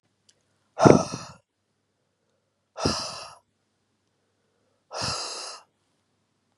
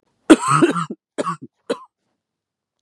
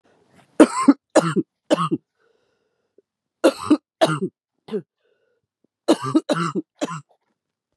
{"exhalation_length": "6.6 s", "exhalation_amplitude": 32768, "exhalation_signal_mean_std_ratio": 0.23, "cough_length": "2.8 s", "cough_amplitude": 32768, "cough_signal_mean_std_ratio": 0.33, "three_cough_length": "7.8 s", "three_cough_amplitude": 32767, "three_cough_signal_mean_std_ratio": 0.33, "survey_phase": "beta (2021-08-13 to 2022-03-07)", "age": "45-64", "gender": "Female", "wearing_mask": "No", "symptom_cough_any": true, "symptom_new_continuous_cough": true, "symptom_runny_or_blocked_nose": true, "symptom_sore_throat": true, "symptom_fatigue": true, "symptom_change_to_sense_of_smell_or_taste": true, "symptom_onset": "5 days", "smoker_status": "Never smoked", "respiratory_condition_asthma": false, "respiratory_condition_other": false, "recruitment_source": "Test and Trace", "submission_delay": "2 days", "covid_test_result": "Positive", "covid_test_method": "LAMP"}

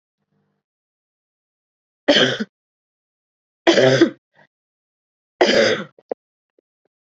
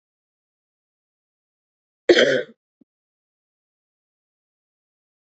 {"three_cough_length": "7.1 s", "three_cough_amplitude": 28298, "three_cough_signal_mean_std_ratio": 0.31, "cough_length": "5.2 s", "cough_amplitude": 27645, "cough_signal_mean_std_ratio": 0.18, "survey_phase": "beta (2021-08-13 to 2022-03-07)", "age": "18-44", "gender": "Female", "wearing_mask": "No", "symptom_cough_any": true, "symptom_runny_or_blocked_nose": true, "symptom_onset": "3 days", "smoker_status": "Never smoked", "respiratory_condition_asthma": false, "respiratory_condition_other": false, "recruitment_source": "Test and Trace", "submission_delay": "2 days", "covid_test_result": "Negative", "covid_test_method": "RT-qPCR"}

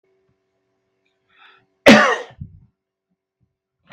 {"cough_length": "3.9 s", "cough_amplitude": 32768, "cough_signal_mean_std_ratio": 0.22, "survey_phase": "beta (2021-08-13 to 2022-03-07)", "age": "45-64", "gender": "Male", "wearing_mask": "No", "symptom_none": true, "smoker_status": "Ex-smoker", "respiratory_condition_asthma": false, "respiratory_condition_other": false, "recruitment_source": "REACT", "submission_delay": "1 day", "covid_test_result": "Negative", "covid_test_method": "RT-qPCR", "influenza_a_test_result": "Unknown/Void", "influenza_b_test_result": "Unknown/Void"}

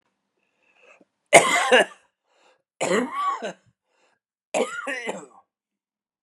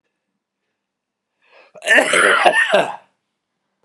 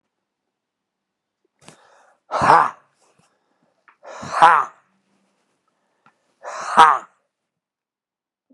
{"three_cough_length": "6.2 s", "three_cough_amplitude": 32768, "three_cough_signal_mean_std_ratio": 0.33, "cough_length": "3.8 s", "cough_amplitude": 32768, "cough_signal_mean_std_ratio": 0.42, "exhalation_length": "8.5 s", "exhalation_amplitude": 32768, "exhalation_signal_mean_std_ratio": 0.24, "survey_phase": "beta (2021-08-13 to 2022-03-07)", "age": "65+", "gender": "Male", "wearing_mask": "No", "symptom_none": true, "smoker_status": "Never smoked", "respiratory_condition_asthma": false, "respiratory_condition_other": false, "recruitment_source": "Test and Trace", "submission_delay": "1 day", "covid_test_result": "Positive", "covid_test_method": "LFT"}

